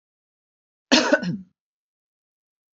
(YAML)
cough_length: 2.7 s
cough_amplitude: 26679
cough_signal_mean_std_ratio: 0.28
survey_phase: beta (2021-08-13 to 2022-03-07)
age: 65+
gender: Female
wearing_mask: 'No'
symptom_none: true
smoker_status: Ex-smoker
respiratory_condition_asthma: false
respiratory_condition_other: false
recruitment_source: REACT
submission_delay: 1 day
covid_test_result: Negative
covid_test_method: RT-qPCR